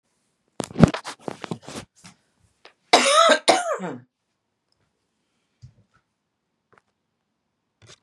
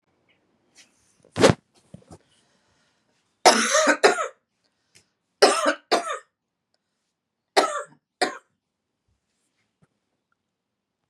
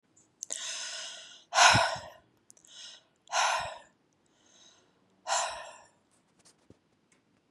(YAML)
cough_length: 8.0 s
cough_amplitude: 32768
cough_signal_mean_std_ratio: 0.27
three_cough_length: 11.1 s
three_cough_amplitude: 31288
three_cough_signal_mean_std_ratio: 0.28
exhalation_length: 7.5 s
exhalation_amplitude: 17077
exhalation_signal_mean_std_ratio: 0.33
survey_phase: beta (2021-08-13 to 2022-03-07)
age: 45-64
gender: Female
wearing_mask: 'No'
symptom_cough_any: true
symptom_runny_or_blocked_nose: true
symptom_sore_throat: true
symptom_fatigue: true
symptom_onset: 3 days
smoker_status: Never smoked
respiratory_condition_asthma: false
respiratory_condition_other: false
recruitment_source: Test and Trace
submission_delay: 1 day
covid_test_result: Positive
covid_test_method: RT-qPCR
covid_ct_value: 23.4
covid_ct_gene: N gene